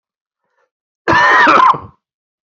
{"cough_length": "2.5 s", "cough_amplitude": 28418, "cough_signal_mean_std_ratio": 0.47, "survey_phase": "beta (2021-08-13 to 2022-03-07)", "age": "45-64", "gender": "Female", "wearing_mask": "No", "symptom_cough_any": true, "symptom_fatigue": true, "symptom_change_to_sense_of_smell_or_taste": true, "symptom_loss_of_taste": true, "symptom_onset": "9 days", "smoker_status": "Never smoked", "respiratory_condition_asthma": false, "respiratory_condition_other": false, "recruitment_source": "Test and Trace", "submission_delay": "1 day", "covid_test_result": "Positive", "covid_test_method": "RT-qPCR", "covid_ct_value": 22.6, "covid_ct_gene": "ORF1ab gene"}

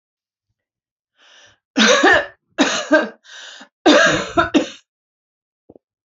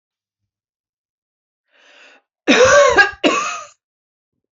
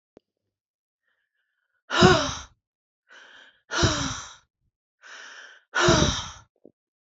{"three_cough_length": "6.1 s", "three_cough_amplitude": 30978, "three_cough_signal_mean_std_ratio": 0.41, "cough_length": "4.5 s", "cough_amplitude": 28579, "cough_signal_mean_std_ratio": 0.36, "exhalation_length": "7.2 s", "exhalation_amplitude": 25206, "exhalation_signal_mean_std_ratio": 0.33, "survey_phase": "beta (2021-08-13 to 2022-03-07)", "age": "18-44", "gender": "Female", "wearing_mask": "No", "symptom_cough_any": true, "symptom_shortness_of_breath": true, "symptom_fatigue": true, "symptom_headache": true, "symptom_loss_of_taste": true, "symptom_onset": "5 days", "smoker_status": "Never smoked", "respiratory_condition_asthma": false, "respiratory_condition_other": false, "recruitment_source": "Test and Trace", "submission_delay": "2 days", "covid_test_result": "Positive", "covid_test_method": "RT-qPCR", "covid_ct_value": 25.7, "covid_ct_gene": "ORF1ab gene"}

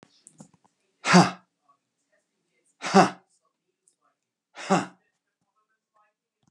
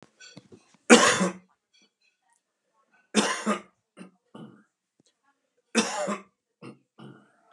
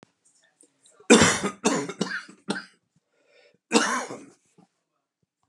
{"exhalation_length": "6.5 s", "exhalation_amplitude": 28448, "exhalation_signal_mean_std_ratio": 0.22, "three_cough_length": "7.5 s", "three_cough_amplitude": 30996, "three_cough_signal_mean_std_ratio": 0.27, "cough_length": "5.5 s", "cough_amplitude": 27754, "cough_signal_mean_std_ratio": 0.33, "survey_phase": "beta (2021-08-13 to 2022-03-07)", "age": "65+", "gender": "Male", "wearing_mask": "No", "symptom_cough_any": true, "symptom_sore_throat": true, "symptom_headache": true, "smoker_status": "Never smoked", "respiratory_condition_asthma": false, "respiratory_condition_other": false, "recruitment_source": "REACT", "submission_delay": "2 days", "covid_test_result": "Negative", "covid_test_method": "RT-qPCR", "influenza_a_test_result": "Negative", "influenza_b_test_result": "Negative"}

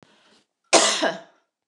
{"cough_length": "1.7 s", "cough_amplitude": 28485, "cough_signal_mean_std_ratio": 0.37, "survey_phase": "beta (2021-08-13 to 2022-03-07)", "age": "45-64", "gender": "Female", "wearing_mask": "No", "symptom_none": true, "smoker_status": "Never smoked", "respiratory_condition_asthma": false, "respiratory_condition_other": false, "recruitment_source": "REACT", "submission_delay": "1 day", "covid_test_result": "Negative", "covid_test_method": "RT-qPCR"}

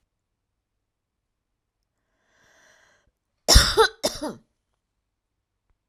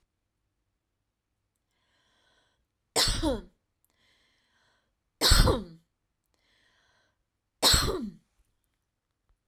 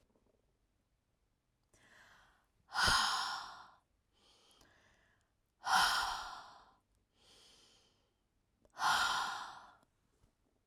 {"cough_length": "5.9 s", "cough_amplitude": 32767, "cough_signal_mean_std_ratio": 0.21, "three_cough_length": "9.5 s", "three_cough_amplitude": 15786, "three_cough_signal_mean_std_ratio": 0.28, "exhalation_length": "10.7 s", "exhalation_amplitude": 4426, "exhalation_signal_mean_std_ratio": 0.36, "survey_phase": "alpha (2021-03-01 to 2021-08-12)", "age": "65+", "gender": "Female", "wearing_mask": "No", "symptom_none": true, "smoker_status": "Ex-smoker", "respiratory_condition_asthma": false, "respiratory_condition_other": false, "recruitment_source": "REACT", "submission_delay": "1 day", "covid_test_result": "Negative", "covid_test_method": "RT-qPCR"}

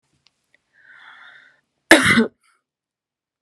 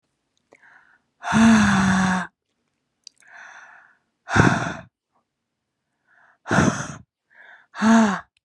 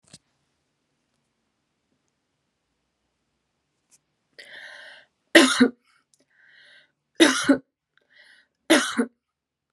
{"cough_length": "3.4 s", "cough_amplitude": 32768, "cough_signal_mean_std_ratio": 0.25, "exhalation_length": "8.4 s", "exhalation_amplitude": 27958, "exhalation_signal_mean_std_ratio": 0.42, "three_cough_length": "9.7 s", "three_cough_amplitude": 31056, "three_cough_signal_mean_std_ratio": 0.23, "survey_phase": "beta (2021-08-13 to 2022-03-07)", "age": "18-44", "gender": "Female", "wearing_mask": "No", "symptom_headache": true, "symptom_onset": "13 days", "smoker_status": "Ex-smoker", "respiratory_condition_asthma": false, "respiratory_condition_other": false, "recruitment_source": "REACT", "submission_delay": "6 days", "covid_test_result": "Negative", "covid_test_method": "RT-qPCR"}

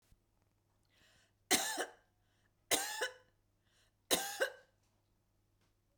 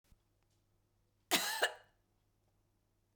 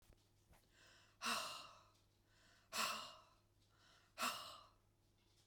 {"three_cough_length": "6.0 s", "three_cough_amplitude": 6179, "three_cough_signal_mean_std_ratio": 0.31, "cough_length": "3.2 s", "cough_amplitude": 4620, "cough_signal_mean_std_ratio": 0.27, "exhalation_length": "5.5 s", "exhalation_amplitude": 1178, "exhalation_signal_mean_std_ratio": 0.41, "survey_phase": "beta (2021-08-13 to 2022-03-07)", "age": "45-64", "gender": "Female", "wearing_mask": "No", "symptom_none": true, "smoker_status": "Never smoked", "respiratory_condition_asthma": false, "respiratory_condition_other": false, "recruitment_source": "REACT", "submission_delay": "0 days", "covid_test_result": "Negative", "covid_test_method": "RT-qPCR"}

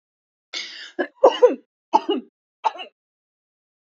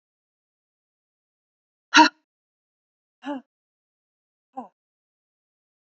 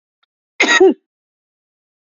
{"three_cough_length": "3.8 s", "three_cough_amplitude": 27260, "three_cough_signal_mean_std_ratio": 0.28, "exhalation_length": "5.8 s", "exhalation_amplitude": 28553, "exhalation_signal_mean_std_ratio": 0.14, "cough_length": "2.0 s", "cough_amplitude": 31110, "cough_signal_mean_std_ratio": 0.32, "survey_phase": "beta (2021-08-13 to 2022-03-07)", "age": "18-44", "gender": "Female", "wearing_mask": "No", "symptom_cough_any": true, "symptom_abdominal_pain": true, "symptom_onset": "6 days", "smoker_status": "Never smoked", "respiratory_condition_asthma": true, "respiratory_condition_other": false, "recruitment_source": "REACT", "submission_delay": "1 day", "covid_test_result": "Negative", "covid_test_method": "RT-qPCR"}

